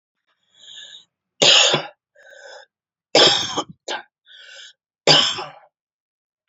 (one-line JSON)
{"three_cough_length": "6.5 s", "three_cough_amplitude": 32768, "three_cough_signal_mean_std_ratio": 0.35, "survey_phase": "beta (2021-08-13 to 2022-03-07)", "age": "45-64", "gender": "Female", "wearing_mask": "No", "symptom_runny_or_blocked_nose": true, "symptom_sore_throat": true, "symptom_onset": "12 days", "smoker_status": "Ex-smoker", "respiratory_condition_asthma": false, "respiratory_condition_other": false, "recruitment_source": "REACT", "submission_delay": "2 days", "covid_test_result": "Negative", "covid_test_method": "RT-qPCR", "influenza_a_test_result": "Negative", "influenza_b_test_result": "Negative"}